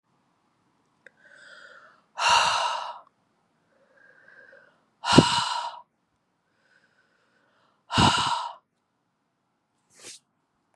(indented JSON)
{
  "exhalation_length": "10.8 s",
  "exhalation_amplitude": 31812,
  "exhalation_signal_mean_std_ratio": 0.31,
  "survey_phase": "beta (2021-08-13 to 2022-03-07)",
  "age": "18-44",
  "gender": "Female",
  "wearing_mask": "No",
  "symptom_cough_any": true,
  "symptom_new_continuous_cough": true,
  "symptom_runny_or_blocked_nose": true,
  "symptom_shortness_of_breath": true,
  "symptom_headache": true,
  "symptom_onset": "3 days",
  "smoker_status": "Ex-smoker",
  "respiratory_condition_asthma": false,
  "respiratory_condition_other": false,
  "recruitment_source": "Test and Trace",
  "submission_delay": "2 days",
  "covid_test_result": "Positive",
  "covid_test_method": "RT-qPCR",
  "covid_ct_value": 31.0,
  "covid_ct_gene": "ORF1ab gene"
}